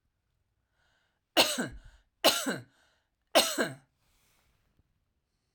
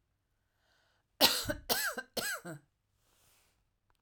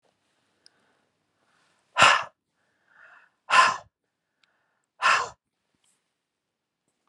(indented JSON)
{
  "three_cough_length": "5.5 s",
  "three_cough_amplitude": 13441,
  "three_cough_signal_mean_std_ratio": 0.29,
  "cough_length": "4.0 s",
  "cough_amplitude": 13876,
  "cough_signal_mean_std_ratio": 0.33,
  "exhalation_length": "7.1 s",
  "exhalation_amplitude": 28885,
  "exhalation_signal_mean_std_ratio": 0.24,
  "survey_phase": "alpha (2021-03-01 to 2021-08-12)",
  "age": "45-64",
  "gender": "Female",
  "wearing_mask": "No",
  "symptom_none": true,
  "symptom_onset": "8 days",
  "smoker_status": "Never smoked",
  "respiratory_condition_asthma": false,
  "respiratory_condition_other": false,
  "recruitment_source": "REACT",
  "submission_delay": "5 days",
  "covid_test_result": "Negative",
  "covid_test_method": "RT-qPCR"
}